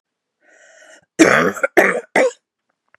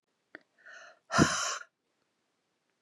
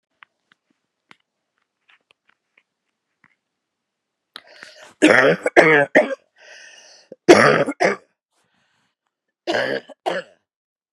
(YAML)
cough_length: 3.0 s
cough_amplitude: 32768
cough_signal_mean_std_ratio: 0.39
exhalation_length: 2.8 s
exhalation_amplitude: 10766
exhalation_signal_mean_std_ratio: 0.29
three_cough_length: 10.9 s
three_cough_amplitude: 32768
three_cough_signal_mean_std_ratio: 0.3
survey_phase: beta (2021-08-13 to 2022-03-07)
age: 45-64
gender: Female
wearing_mask: 'No'
symptom_cough_any: true
symptom_runny_or_blocked_nose: true
symptom_fatigue: true
symptom_change_to_sense_of_smell_or_taste: true
symptom_onset: 7 days
smoker_status: Never smoked
respiratory_condition_asthma: false
respiratory_condition_other: false
recruitment_source: Test and Trace
submission_delay: 2 days
covid_test_result: Positive
covid_test_method: RT-qPCR
covid_ct_value: 21.6
covid_ct_gene: ORF1ab gene